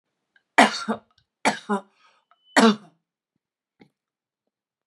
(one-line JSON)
{"three_cough_length": "4.9 s", "three_cough_amplitude": 30093, "three_cough_signal_mean_std_ratio": 0.25, "survey_phase": "beta (2021-08-13 to 2022-03-07)", "age": "45-64", "gender": "Female", "wearing_mask": "No", "symptom_none": true, "smoker_status": "Never smoked", "respiratory_condition_asthma": false, "respiratory_condition_other": false, "recruitment_source": "REACT", "submission_delay": "0 days", "covid_test_result": "Negative", "covid_test_method": "RT-qPCR", "influenza_a_test_result": "Negative", "influenza_b_test_result": "Negative"}